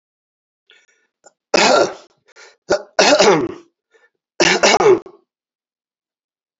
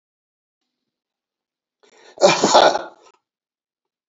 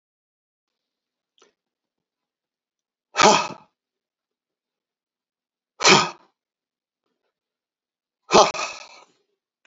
{"three_cough_length": "6.6 s", "three_cough_amplitude": 31923, "three_cough_signal_mean_std_ratio": 0.39, "cough_length": "4.1 s", "cough_amplitude": 28069, "cough_signal_mean_std_ratio": 0.28, "exhalation_length": "9.7 s", "exhalation_amplitude": 32767, "exhalation_signal_mean_std_ratio": 0.21, "survey_phase": "alpha (2021-03-01 to 2021-08-12)", "age": "65+", "gender": "Male", "wearing_mask": "No", "symptom_shortness_of_breath": true, "symptom_fatigue": true, "smoker_status": "Ex-smoker", "respiratory_condition_asthma": false, "respiratory_condition_other": false, "recruitment_source": "REACT", "submission_delay": "2 days", "covid_test_result": "Negative", "covid_test_method": "RT-qPCR"}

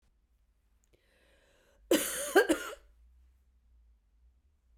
{"cough_length": "4.8 s", "cough_amplitude": 9393, "cough_signal_mean_std_ratio": 0.27, "survey_phase": "beta (2021-08-13 to 2022-03-07)", "age": "65+", "gender": "Female", "wearing_mask": "No", "symptom_cough_any": true, "symptom_runny_or_blocked_nose": true, "symptom_fatigue": true, "symptom_onset": "3 days", "smoker_status": "Ex-smoker", "respiratory_condition_asthma": false, "respiratory_condition_other": false, "recruitment_source": "Test and Trace", "submission_delay": "2 days", "covid_test_result": "Positive", "covid_test_method": "RT-qPCR", "covid_ct_value": 20.0, "covid_ct_gene": "ORF1ab gene", "covid_ct_mean": 20.2, "covid_viral_load": "230000 copies/ml", "covid_viral_load_category": "Low viral load (10K-1M copies/ml)"}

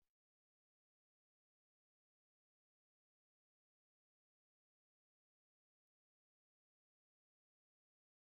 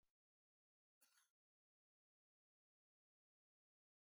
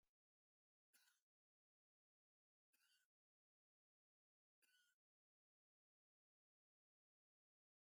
{"exhalation_length": "8.4 s", "exhalation_amplitude": 4, "exhalation_signal_mean_std_ratio": 0.07, "cough_length": "4.2 s", "cough_amplitude": 28, "cough_signal_mean_std_ratio": 0.19, "three_cough_length": "7.9 s", "three_cough_amplitude": 32, "three_cough_signal_mean_std_ratio": 0.24, "survey_phase": "alpha (2021-03-01 to 2021-08-12)", "age": "65+", "gender": "Male", "wearing_mask": "No", "symptom_shortness_of_breath": true, "smoker_status": "Ex-smoker", "respiratory_condition_asthma": true, "respiratory_condition_other": false, "recruitment_source": "REACT", "submission_delay": "3 days", "covid_test_result": "Negative", "covid_test_method": "RT-qPCR"}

